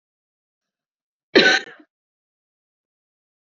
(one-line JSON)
{"cough_length": "3.4 s", "cough_amplitude": 29718, "cough_signal_mean_std_ratio": 0.21, "survey_phase": "beta (2021-08-13 to 2022-03-07)", "age": "18-44", "gender": "Female", "wearing_mask": "No", "symptom_runny_or_blocked_nose": true, "symptom_sore_throat": true, "symptom_onset": "6 days", "smoker_status": "Never smoked", "respiratory_condition_asthma": false, "respiratory_condition_other": false, "recruitment_source": "Test and Trace", "submission_delay": "2 days", "covid_test_result": "Negative", "covid_test_method": "RT-qPCR"}